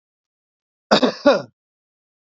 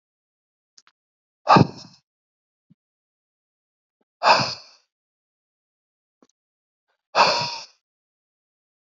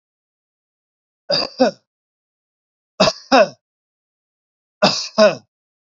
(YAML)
cough_length: 2.4 s
cough_amplitude: 31231
cough_signal_mean_std_ratio: 0.29
exhalation_length: 9.0 s
exhalation_amplitude: 27408
exhalation_signal_mean_std_ratio: 0.22
three_cough_length: 6.0 s
three_cough_amplitude: 30124
three_cough_signal_mean_std_ratio: 0.3
survey_phase: beta (2021-08-13 to 2022-03-07)
age: 45-64
gender: Male
wearing_mask: 'No'
symptom_none: true
smoker_status: Ex-smoker
respiratory_condition_asthma: false
respiratory_condition_other: false
recruitment_source: REACT
submission_delay: 1 day
covid_test_result: Negative
covid_test_method: RT-qPCR
influenza_a_test_result: Negative
influenza_b_test_result: Negative